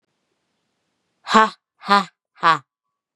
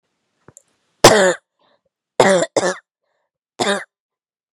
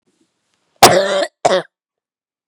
{"exhalation_length": "3.2 s", "exhalation_amplitude": 32767, "exhalation_signal_mean_std_ratio": 0.28, "three_cough_length": "4.5 s", "three_cough_amplitude": 32768, "three_cough_signal_mean_std_ratio": 0.33, "cough_length": "2.5 s", "cough_amplitude": 32768, "cough_signal_mean_std_ratio": 0.36, "survey_phase": "beta (2021-08-13 to 2022-03-07)", "age": "18-44", "gender": "Female", "wearing_mask": "No", "symptom_cough_any": true, "symptom_new_continuous_cough": true, "symptom_runny_or_blocked_nose": true, "symptom_sore_throat": true, "symptom_headache": true, "smoker_status": "Never smoked", "respiratory_condition_asthma": false, "respiratory_condition_other": false, "recruitment_source": "Test and Trace", "submission_delay": "1 day", "covid_test_result": "Positive", "covid_test_method": "LFT"}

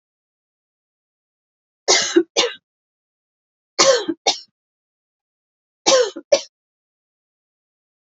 {"three_cough_length": "8.2 s", "three_cough_amplitude": 31156, "three_cough_signal_mean_std_ratio": 0.28, "survey_phase": "beta (2021-08-13 to 2022-03-07)", "age": "18-44", "gender": "Female", "wearing_mask": "No", "symptom_none": true, "symptom_onset": "12 days", "smoker_status": "Never smoked", "respiratory_condition_asthma": true, "respiratory_condition_other": false, "recruitment_source": "REACT", "submission_delay": "1 day", "covid_test_result": "Negative", "covid_test_method": "RT-qPCR", "influenza_a_test_result": "Unknown/Void", "influenza_b_test_result": "Unknown/Void"}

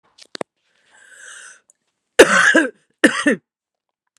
{"cough_length": "4.2 s", "cough_amplitude": 32768, "cough_signal_mean_std_ratio": 0.31, "survey_phase": "beta (2021-08-13 to 2022-03-07)", "age": "18-44", "gender": "Female", "wearing_mask": "No", "symptom_cough_any": true, "symptom_runny_or_blocked_nose": true, "symptom_shortness_of_breath": true, "symptom_sore_throat": true, "symptom_fatigue": true, "symptom_headache": true, "symptom_onset": "3 days", "smoker_status": "Current smoker (11 or more cigarettes per day)", "respiratory_condition_asthma": false, "respiratory_condition_other": false, "recruitment_source": "Test and Trace", "submission_delay": "1 day", "covid_test_result": "Positive", "covid_test_method": "RT-qPCR", "covid_ct_value": 22.3, "covid_ct_gene": "ORF1ab gene"}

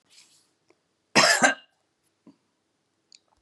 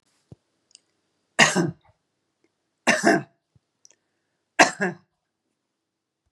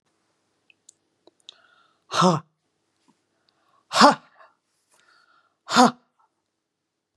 {"cough_length": "3.4 s", "cough_amplitude": 22627, "cough_signal_mean_std_ratio": 0.26, "three_cough_length": "6.3 s", "three_cough_amplitude": 32767, "three_cough_signal_mean_std_ratio": 0.26, "exhalation_length": "7.2 s", "exhalation_amplitude": 32767, "exhalation_signal_mean_std_ratio": 0.22, "survey_phase": "beta (2021-08-13 to 2022-03-07)", "age": "65+", "gender": "Female", "wearing_mask": "No", "symptom_none": true, "smoker_status": "Prefer not to say", "respiratory_condition_asthma": false, "respiratory_condition_other": false, "recruitment_source": "REACT", "submission_delay": "0 days", "covid_test_result": "Negative", "covid_test_method": "RT-qPCR", "influenza_a_test_result": "Negative", "influenza_b_test_result": "Negative"}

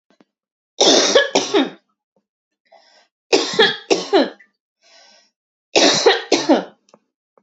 {"three_cough_length": "7.4 s", "three_cough_amplitude": 32768, "three_cough_signal_mean_std_ratio": 0.43, "survey_phase": "beta (2021-08-13 to 2022-03-07)", "age": "18-44", "gender": "Female", "wearing_mask": "No", "symptom_cough_any": true, "symptom_runny_or_blocked_nose": true, "smoker_status": "Never smoked", "respiratory_condition_asthma": false, "respiratory_condition_other": false, "recruitment_source": "REACT", "submission_delay": "1 day", "covid_test_result": "Negative", "covid_test_method": "RT-qPCR", "influenza_a_test_result": "Negative", "influenza_b_test_result": "Negative"}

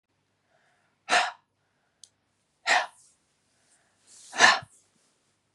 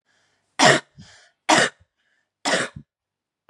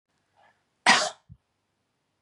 {"exhalation_length": "5.5 s", "exhalation_amplitude": 25651, "exhalation_signal_mean_std_ratio": 0.25, "three_cough_length": "3.5 s", "three_cough_amplitude": 29543, "three_cough_signal_mean_std_ratio": 0.32, "cough_length": "2.2 s", "cough_amplitude": 20265, "cough_signal_mean_std_ratio": 0.24, "survey_phase": "beta (2021-08-13 to 2022-03-07)", "age": "18-44", "gender": "Female", "wearing_mask": "No", "symptom_new_continuous_cough": true, "symptom_runny_or_blocked_nose": true, "symptom_shortness_of_breath": true, "symptom_sore_throat": true, "symptom_fatigue": true, "symptom_headache": true, "symptom_onset": "2 days", "smoker_status": "Ex-smoker", "respiratory_condition_asthma": false, "respiratory_condition_other": false, "recruitment_source": "Test and Trace", "submission_delay": "1 day", "covid_test_result": "Positive", "covid_test_method": "RT-qPCR", "covid_ct_value": 25.9, "covid_ct_gene": "N gene"}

